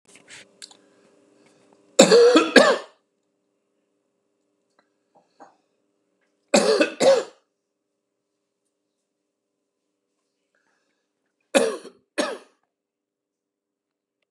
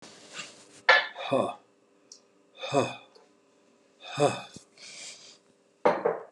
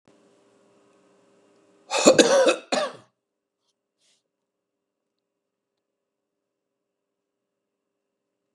three_cough_length: 14.3 s
three_cough_amplitude: 32768
three_cough_signal_mean_std_ratio: 0.26
exhalation_length: 6.3 s
exhalation_amplitude: 20541
exhalation_signal_mean_std_ratio: 0.36
cough_length: 8.5 s
cough_amplitude: 32767
cough_signal_mean_std_ratio: 0.22
survey_phase: beta (2021-08-13 to 2022-03-07)
age: 65+
gender: Male
wearing_mask: 'No'
symptom_none: true
smoker_status: Ex-smoker
respiratory_condition_asthma: false
respiratory_condition_other: true
recruitment_source: REACT
submission_delay: 1 day
covid_test_result: Negative
covid_test_method: RT-qPCR
influenza_a_test_result: Negative
influenza_b_test_result: Negative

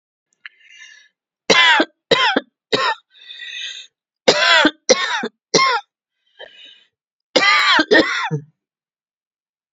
three_cough_length: 9.7 s
three_cough_amplitude: 32768
three_cough_signal_mean_std_ratio: 0.44
survey_phase: beta (2021-08-13 to 2022-03-07)
age: 65+
gender: Female
wearing_mask: 'No'
symptom_none: true
smoker_status: Never smoked
respiratory_condition_asthma: true
respiratory_condition_other: false
recruitment_source: REACT
submission_delay: 1 day
covid_test_result: Negative
covid_test_method: RT-qPCR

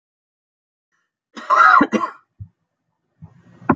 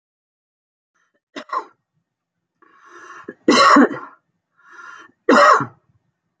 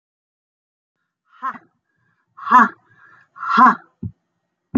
cough_length: 3.8 s
cough_amplitude: 27792
cough_signal_mean_std_ratio: 0.32
three_cough_length: 6.4 s
three_cough_amplitude: 31902
three_cough_signal_mean_std_ratio: 0.31
exhalation_length: 4.8 s
exhalation_amplitude: 27748
exhalation_signal_mean_std_ratio: 0.28
survey_phase: beta (2021-08-13 to 2022-03-07)
age: 45-64
gender: Female
wearing_mask: 'No'
symptom_runny_or_blocked_nose: true
smoker_status: Ex-smoker
respiratory_condition_asthma: false
respiratory_condition_other: false
recruitment_source: REACT
submission_delay: 1 day
covid_test_result: Negative
covid_test_method: RT-qPCR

